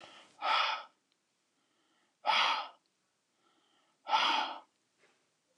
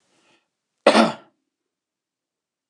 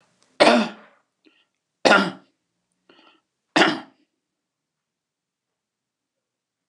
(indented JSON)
{
  "exhalation_length": "5.6 s",
  "exhalation_amplitude": 4813,
  "exhalation_signal_mean_std_ratio": 0.39,
  "cough_length": "2.7 s",
  "cough_amplitude": 29204,
  "cough_signal_mean_std_ratio": 0.23,
  "three_cough_length": "6.7 s",
  "three_cough_amplitude": 29203,
  "three_cough_signal_mean_std_ratio": 0.25,
  "survey_phase": "beta (2021-08-13 to 2022-03-07)",
  "age": "65+",
  "gender": "Male",
  "wearing_mask": "No",
  "symptom_none": true,
  "smoker_status": "Ex-smoker",
  "respiratory_condition_asthma": false,
  "respiratory_condition_other": false,
  "recruitment_source": "REACT",
  "submission_delay": "2 days",
  "covid_test_result": "Negative",
  "covid_test_method": "RT-qPCR"
}